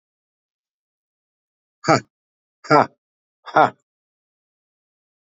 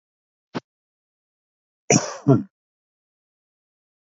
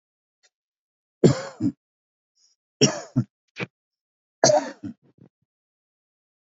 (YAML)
exhalation_length: 5.2 s
exhalation_amplitude: 27599
exhalation_signal_mean_std_ratio: 0.2
cough_length: 4.0 s
cough_amplitude: 26884
cough_signal_mean_std_ratio: 0.21
three_cough_length: 6.5 s
three_cough_amplitude: 26515
three_cough_signal_mean_std_ratio: 0.25
survey_phase: beta (2021-08-13 to 2022-03-07)
age: 45-64
gender: Male
wearing_mask: 'No'
symptom_none: true
symptom_onset: 12 days
smoker_status: Ex-smoker
respiratory_condition_asthma: false
respiratory_condition_other: false
recruitment_source: REACT
submission_delay: 1 day
covid_test_result: Negative
covid_test_method: RT-qPCR
influenza_a_test_result: Unknown/Void
influenza_b_test_result: Unknown/Void